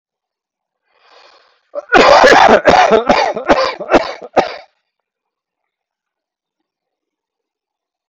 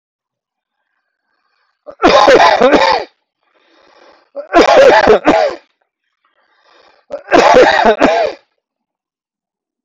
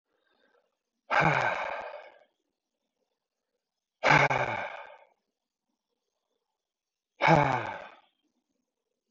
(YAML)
cough_length: 8.1 s
cough_amplitude: 32768
cough_signal_mean_std_ratio: 0.39
three_cough_length: 9.8 s
three_cough_amplitude: 32768
three_cough_signal_mean_std_ratio: 0.46
exhalation_length: 9.1 s
exhalation_amplitude: 15778
exhalation_signal_mean_std_ratio: 0.32
survey_phase: beta (2021-08-13 to 2022-03-07)
age: 45-64
gender: Male
wearing_mask: 'No'
symptom_cough_any: true
symptom_runny_or_blocked_nose: true
symptom_onset: 7 days
smoker_status: Never smoked
respiratory_condition_asthma: false
respiratory_condition_other: false
recruitment_source: REACT
submission_delay: 2 days
covid_test_result: Negative
covid_test_method: RT-qPCR
influenza_a_test_result: Unknown/Void
influenza_b_test_result: Unknown/Void